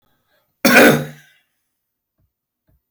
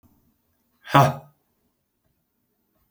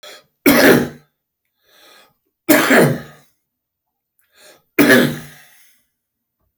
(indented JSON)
{
  "cough_length": "2.9 s",
  "cough_amplitude": 31782,
  "cough_signal_mean_std_ratio": 0.3,
  "exhalation_length": "2.9 s",
  "exhalation_amplitude": 28278,
  "exhalation_signal_mean_std_ratio": 0.21,
  "three_cough_length": "6.6 s",
  "three_cough_amplitude": 32768,
  "three_cough_signal_mean_std_ratio": 0.37,
  "survey_phase": "beta (2021-08-13 to 2022-03-07)",
  "age": "45-64",
  "gender": "Male",
  "wearing_mask": "No",
  "symptom_cough_any": true,
  "symptom_onset": "6 days",
  "smoker_status": "Prefer not to say",
  "respiratory_condition_asthma": true,
  "respiratory_condition_other": false,
  "recruitment_source": "REACT",
  "submission_delay": "1 day",
  "covid_test_result": "Negative",
  "covid_test_method": "RT-qPCR"
}